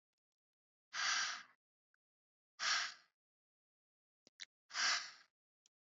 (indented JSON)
{
  "exhalation_length": "5.9 s",
  "exhalation_amplitude": 2083,
  "exhalation_signal_mean_std_ratio": 0.34,
  "survey_phase": "beta (2021-08-13 to 2022-03-07)",
  "age": "18-44",
  "gender": "Female",
  "wearing_mask": "No",
  "symptom_cough_any": true,
  "symptom_sore_throat": true,
  "smoker_status": "Never smoked",
  "respiratory_condition_asthma": false,
  "respiratory_condition_other": false,
  "recruitment_source": "Test and Trace",
  "submission_delay": "0 days",
  "covid_test_result": "Negative",
  "covid_test_method": "LFT"
}